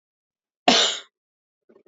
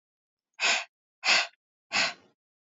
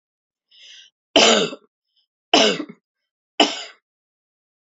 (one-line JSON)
{"cough_length": "1.9 s", "cough_amplitude": 27046, "cough_signal_mean_std_ratio": 0.3, "exhalation_length": "2.7 s", "exhalation_amplitude": 10990, "exhalation_signal_mean_std_ratio": 0.38, "three_cough_length": "4.7 s", "three_cough_amplitude": 29746, "three_cough_signal_mean_std_ratio": 0.31, "survey_phase": "beta (2021-08-13 to 2022-03-07)", "age": "18-44", "gender": "Female", "wearing_mask": "No", "symptom_cough_any": true, "symptom_sore_throat": true, "symptom_headache": true, "smoker_status": "Ex-smoker", "respiratory_condition_asthma": false, "respiratory_condition_other": false, "recruitment_source": "Test and Trace", "submission_delay": "1 day", "covid_test_result": "Positive", "covid_test_method": "RT-qPCR"}